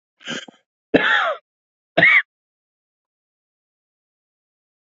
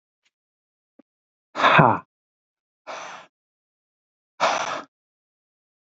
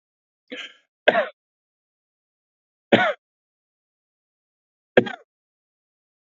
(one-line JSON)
{"cough_length": "4.9 s", "cough_amplitude": 27481, "cough_signal_mean_std_ratio": 0.3, "exhalation_length": "6.0 s", "exhalation_amplitude": 27515, "exhalation_signal_mean_std_ratio": 0.26, "three_cough_length": "6.4 s", "three_cough_amplitude": 32767, "three_cough_signal_mean_std_ratio": 0.19, "survey_phase": "beta (2021-08-13 to 2022-03-07)", "age": "65+", "gender": "Male", "wearing_mask": "No", "symptom_none": true, "smoker_status": "Never smoked", "respiratory_condition_asthma": false, "respiratory_condition_other": false, "recruitment_source": "REACT", "submission_delay": "2 days", "covid_test_result": "Negative", "covid_test_method": "RT-qPCR", "influenza_a_test_result": "Negative", "influenza_b_test_result": "Negative"}